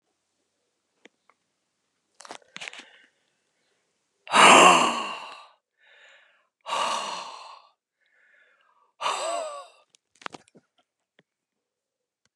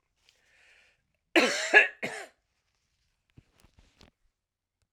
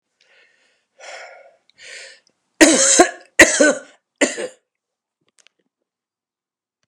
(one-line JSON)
{"exhalation_length": "12.4 s", "exhalation_amplitude": 27790, "exhalation_signal_mean_std_ratio": 0.25, "cough_length": "4.9 s", "cough_amplitude": 17024, "cough_signal_mean_std_ratio": 0.23, "three_cough_length": "6.9 s", "three_cough_amplitude": 32768, "three_cough_signal_mean_std_ratio": 0.29, "survey_phase": "alpha (2021-03-01 to 2021-08-12)", "age": "65+", "gender": "Male", "wearing_mask": "No", "symptom_cough_any": true, "smoker_status": "Ex-smoker", "respiratory_condition_asthma": false, "respiratory_condition_other": false, "recruitment_source": "Test and Trace", "submission_delay": "1 day", "covid_test_result": "Positive", "covid_test_method": "RT-qPCR", "covid_ct_value": 11.1, "covid_ct_gene": "N gene", "covid_ct_mean": 11.7, "covid_viral_load": "150000000 copies/ml", "covid_viral_load_category": "High viral load (>1M copies/ml)"}